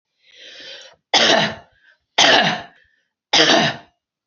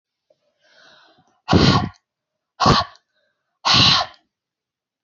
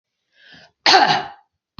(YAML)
three_cough_length: 4.3 s
three_cough_amplitude: 31970
three_cough_signal_mean_std_ratio: 0.45
exhalation_length: 5.0 s
exhalation_amplitude: 29311
exhalation_signal_mean_std_ratio: 0.37
cough_length: 1.8 s
cough_amplitude: 31293
cough_signal_mean_std_ratio: 0.37
survey_phase: beta (2021-08-13 to 2022-03-07)
age: 45-64
gender: Female
wearing_mask: 'No'
symptom_none: true
smoker_status: Never smoked
respiratory_condition_asthma: true
respiratory_condition_other: false
recruitment_source: REACT
submission_delay: 1 day
covid_test_result: Negative
covid_test_method: RT-qPCR